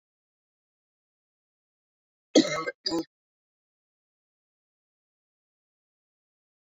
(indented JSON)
{
  "cough_length": "6.7 s",
  "cough_amplitude": 15332,
  "cough_signal_mean_std_ratio": 0.17,
  "survey_phase": "beta (2021-08-13 to 2022-03-07)",
  "age": "45-64",
  "gender": "Female",
  "wearing_mask": "No",
  "symptom_cough_any": true,
  "symptom_fatigue": true,
  "symptom_headache": true,
  "symptom_change_to_sense_of_smell_or_taste": true,
  "symptom_loss_of_taste": true,
  "symptom_onset": "5 days",
  "smoker_status": "Never smoked",
  "respiratory_condition_asthma": false,
  "respiratory_condition_other": false,
  "recruitment_source": "Test and Trace",
  "submission_delay": "2 days",
  "covid_test_result": "Positive",
  "covid_test_method": "RT-qPCR",
  "covid_ct_value": 17.6,
  "covid_ct_gene": "ORF1ab gene",
  "covid_ct_mean": 17.9,
  "covid_viral_load": "1400000 copies/ml",
  "covid_viral_load_category": "High viral load (>1M copies/ml)"
}